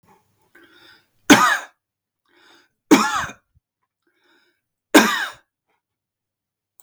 {"three_cough_length": "6.8 s", "three_cough_amplitude": 32768, "three_cough_signal_mean_std_ratio": 0.26, "survey_phase": "beta (2021-08-13 to 2022-03-07)", "age": "45-64", "gender": "Male", "wearing_mask": "No", "symptom_none": true, "smoker_status": "Never smoked", "respiratory_condition_asthma": true, "respiratory_condition_other": false, "recruitment_source": "REACT", "submission_delay": "2 days", "covid_test_result": "Negative", "covid_test_method": "RT-qPCR", "influenza_a_test_result": "Negative", "influenza_b_test_result": "Negative"}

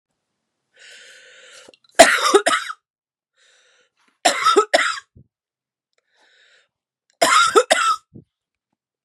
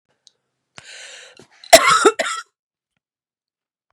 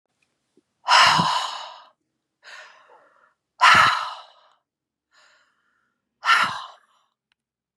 {"three_cough_length": "9.0 s", "three_cough_amplitude": 32768, "three_cough_signal_mean_std_ratio": 0.34, "cough_length": "3.9 s", "cough_amplitude": 32768, "cough_signal_mean_std_ratio": 0.26, "exhalation_length": "7.8 s", "exhalation_amplitude": 27240, "exhalation_signal_mean_std_ratio": 0.34, "survey_phase": "beta (2021-08-13 to 2022-03-07)", "age": "45-64", "gender": "Female", "wearing_mask": "No", "symptom_cough_any": true, "symptom_runny_or_blocked_nose": true, "symptom_sore_throat": true, "symptom_fatigue": true, "symptom_headache": true, "symptom_onset": "3 days", "smoker_status": "Ex-smoker", "respiratory_condition_asthma": false, "respiratory_condition_other": false, "recruitment_source": "Test and Trace", "submission_delay": "2 days", "covid_test_result": "Positive", "covid_test_method": "ePCR"}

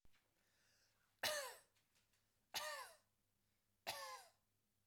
{"three_cough_length": "4.9 s", "three_cough_amplitude": 1340, "three_cough_signal_mean_std_ratio": 0.37, "survey_phase": "beta (2021-08-13 to 2022-03-07)", "age": "18-44", "gender": "Female", "wearing_mask": "No", "symptom_none": true, "smoker_status": "Ex-smoker", "respiratory_condition_asthma": false, "respiratory_condition_other": false, "recruitment_source": "REACT", "submission_delay": "2 days", "covid_test_result": "Negative", "covid_test_method": "RT-qPCR", "influenza_a_test_result": "Unknown/Void", "influenza_b_test_result": "Unknown/Void"}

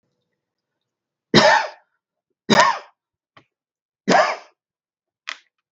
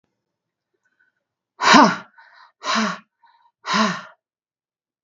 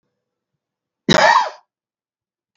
{"three_cough_length": "5.7 s", "three_cough_amplitude": 32768, "three_cough_signal_mean_std_ratio": 0.3, "exhalation_length": "5.0 s", "exhalation_amplitude": 32768, "exhalation_signal_mean_std_ratio": 0.31, "cough_length": "2.6 s", "cough_amplitude": 32768, "cough_signal_mean_std_ratio": 0.31, "survey_phase": "beta (2021-08-13 to 2022-03-07)", "age": "45-64", "gender": "Female", "wearing_mask": "No", "symptom_cough_any": true, "symptom_shortness_of_breath": true, "smoker_status": "Current smoker (1 to 10 cigarettes per day)", "respiratory_condition_asthma": true, "respiratory_condition_other": false, "recruitment_source": "REACT", "submission_delay": "3 days", "covid_test_result": "Negative", "covid_test_method": "RT-qPCR"}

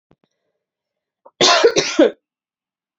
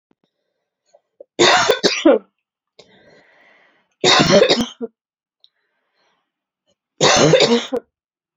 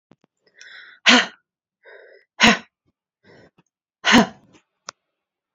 {"cough_length": "3.0 s", "cough_amplitude": 32081, "cough_signal_mean_std_ratio": 0.35, "three_cough_length": "8.4 s", "three_cough_amplitude": 32628, "three_cough_signal_mean_std_ratio": 0.4, "exhalation_length": "5.5 s", "exhalation_amplitude": 29904, "exhalation_signal_mean_std_ratio": 0.26, "survey_phase": "beta (2021-08-13 to 2022-03-07)", "age": "18-44", "gender": "Female", "wearing_mask": "No", "symptom_runny_or_blocked_nose": true, "symptom_onset": "6 days", "smoker_status": "Never smoked", "respiratory_condition_asthma": true, "respiratory_condition_other": false, "recruitment_source": "REACT", "submission_delay": "2 days", "covid_test_result": "Negative", "covid_test_method": "RT-qPCR", "influenza_a_test_result": "Unknown/Void", "influenza_b_test_result": "Unknown/Void"}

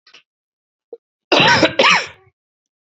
{"cough_length": "3.0 s", "cough_amplitude": 31578, "cough_signal_mean_std_ratio": 0.39, "survey_phase": "beta (2021-08-13 to 2022-03-07)", "age": "45-64", "gender": "Male", "wearing_mask": "Yes", "symptom_cough_any": true, "symptom_runny_or_blocked_nose": true, "symptom_fever_high_temperature": true, "symptom_headache": true, "symptom_change_to_sense_of_smell_or_taste": true, "symptom_onset": "3 days", "smoker_status": "Never smoked", "respiratory_condition_asthma": false, "respiratory_condition_other": false, "recruitment_source": "Test and Trace", "submission_delay": "2 days", "covid_test_result": "Positive", "covid_test_method": "RT-qPCR"}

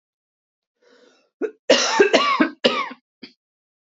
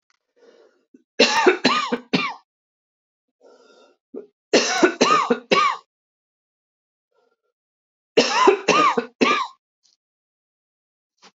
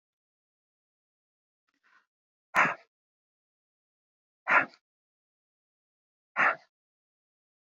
{"cough_length": "3.8 s", "cough_amplitude": 26870, "cough_signal_mean_std_ratio": 0.4, "three_cough_length": "11.3 s", "three_cough_amplitude": 27766, "three_cough_signal_mean_std_ratio": 0.39, "exhalation_length": "7.8 s", "exhalation_amplitude": 11057, "exhalation_signal_mean_std_ratio": 0.2, "survey_phase": "beta (2021-08-13 to 2022-03-07)", "age": "45-64", "gender": "Female", "wearing_mask": "No", "symptom_none": true, "smoker_status": "Ex-smoker", "respiratory_condition_asthma": false, "respiratory_condition_other": false, "recruitment_source": "REACT", "submission_delay": "1 day", "covid_test_result": "Negative", "covid_test_method": "RT-qPCR", "influenza_a_test_result": "Negative", "influenza_b_test_result": "Negative"}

